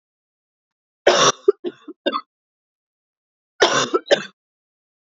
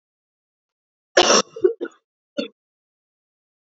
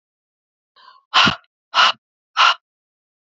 {"three_cough_length": "5.0 s", "three_cough_amplitude": 32767, "three_cough_signal_mean_std_ratio": 0.31, "cough_length": "3.8 s", "cough_amplitude": 29794, "cough_signal_mean_std_ratio": 0.26, "exhalation_length": "3.2 s", "exhalation_amplitude": 28878, "exhalation_signal_mean_std_ratio": 0.33, "survey_phase": "alpha (2021-03-01 to 2021-08-12)", "age": "18-44", "gender": "Female", "wearing_mask": "No", "symptom_cough_any": true, "symptom_headache": true, "symptom_onset": "4 days", "smoker_status": "Never smoked", "respiratory_condition_asthma": false, "respiratory_condition_other": false, "recruitment_source": "Test and Trace", "submission_delay": "2 days", "covid_test_result": "Positive", "covid_test_method": "ePCR"}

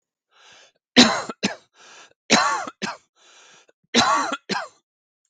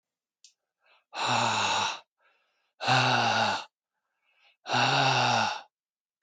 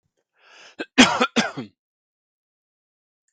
{"three_cough_length": "5.3 s", "three_cough_amplitude": 32768, "three_cough_signal_mean_std_ratio": 0.37, "exhalation_length": "6.2 s", "exhalation_amplitude": 8771, "exhalation_signal_mean_std_ratio": 0.56, "cough_length": "3.3 s", "cough_amplitude": 32768, "cough_signal_mean_std_ratio": 0.25, "survey_phase": "beta (2021-08-13 to 2022-03-07)", "age": "45-64", "gender": "Male", "wearing_mask": "No", "symptom_none": true, "smoker_status": "Never smoked", "respiratory_condition_asthma": false, "respiratory_condition_other": false, "recruitment_source": "REACT", "submission_delay": "1 day", "covid_test_result": "Negative", "covid_test_method": "RT-qPCR", "influenza_a_test_result": "Unknown/Void", "influenza_b_test_result": "Unknown/Void"}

